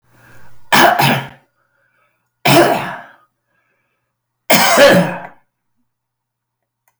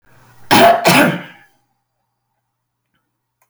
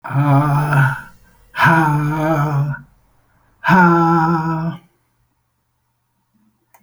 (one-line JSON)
{"three_cough_length": "7.0 s", "three_cough_amplitude": 32768, "three_cough_signal_mean_std_ratio": 0.41, "cough_length": "3.5 s", "cough_amplitude": 32768, "cough_signal_mean_std_ratio": 0.36, "exhalation_length": "6.8 s", "exhalation_amplitude": 30002, "exhalation_signal_mean_std_ratio": 0.62, "survey_phase": "alpha (2021-03-01 to 2021-08-12)", "age": "65+", "gender": "Male", "wearing_mask": "No", "symptom_none": true, "smoker_status": "Never smoked", "respiratory_condition_asthma": false, "respiratory_condition_other": false, "recruitment_source": "REACT", "submission_delay": "3 days", "covid_test_result": "Negative", "covid_test_method": "RT-qPCR"}